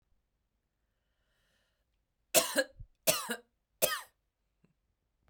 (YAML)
three_cough_length: 5.3 s
three_cough_amplitude: 11777
three_cough_signal_mean_std_ratio: 0.25
survey_phase: beta (2021-08-13 to 2022-03-07)
age: 18-44
gender: Female
wearing_mask: 'No'
symptom_none: true
symptom_onset: 5 days
smoker_status: Ex-smoker
respiratory_condition_asthma: false
respiratory_condition_other: false
recruitment_source: REACT
submission_delay: 1 day
covid_test_result: Negative
covid_test_method: RT-qPCR
influenza_a_test_result: Unknown/Void
influenza_b_test_result: Unknown/Void